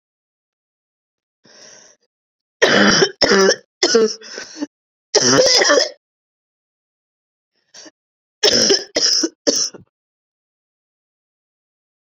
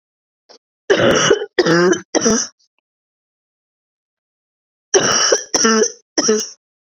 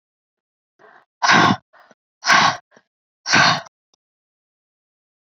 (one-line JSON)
{"cough_length": "12.1 s", "cough_amplitude": 32768, "cough_signal_mean_std_ratio": 0.4, "three_cough_length": "7.0 s", "three_cough_amplitude": 31103, "three_cough_signal_mean_std_ratio": 0.49, "exhalation_length": "5.4 s", "exhalation_amplitude": 27796, "exhalation_signal_mean_std_ratio": 0.34, "survey_phase": "beta (2021-08-13 to 2022-03-07)", "age": "18-44", "gender": "Female", "wearing_mask": "No", "symptom_cough_any": true, "symptom_new_continuous_cough": true, "symptom_shortness_of_breath": true, "symptom_sore_throat": true, "symptom_fatigue": true, "symptom_fever_high_temperature": true, "symptom_other": true, "symptom_onset": "5 days", "smoker_status": "Never smoked", "respiratory_condition_asthma": false, "respiratory_condition_other": false, "recruitment_source": "Test and Trace", "submission_delay": "2 days", "covid_test_result": "Positive", "covid_test_method": "RT-qPCR", "covid_ct_value": 28.0, "covid_ct_gene": "ORF1ab gene", "covid_ct_mean": 28.4, "covid_viral_load": "490 copies/ml", "covid_viral_load_category": "Minimal viral load (< 10K copies/ml)"}